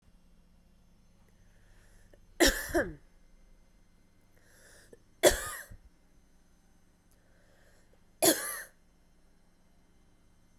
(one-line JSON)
{"three_cough_length": "10.6 s", "three_cough_amplitude": 12928, "three_cough_signal_mean_std_ratio": 0.25, "survey_phase": "beta (2021-08-13 to 2022-03-07)", "age": "18-44", "gender": "Female", "wearing_mask": "No", "symptom_fatigue": true, "smoker_status": "Ex-smoker", "respiratory_condition_asthma": false, "respiratory_condition_other": false, "recruitment_source": "REACT", "submission_delay": "0 days", "covid_test_result": "Negative", "covid_test_method": "RT-qPCR"}